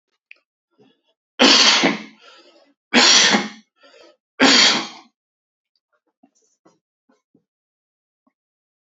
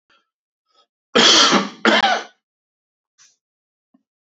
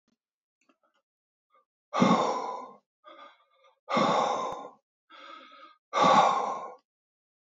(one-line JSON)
{"three_cough_length": "8.9 s", "three_cough_amplitude": 32767, "three_cough_signal_mean_std_ratio": 0.34, "cough_length": "4.3 s", "cough_amplitude": 32410, "cough_signal_mean_std_ratio": 0.37, "exhalation_length": "7.5 s", "exhalation_amplitude": 11996, "exhalation_signal_mean_std_ratio": 0.41, "survey_phase": "alpha (2021-03-01 to 2021-08-12)", "age": "45-64", "gender": "Male", "wearing_mask": "No", "symptom_none": true, "smoker_status": "Ex-smoker", "respiratory_condition_asthma": false, "respiratory_condition_other": false, "recruitment_source": "REACT", "submission_delay": "2 days", "covid_test_result": "Negative", "covid_test_method": "RT-qPCR"}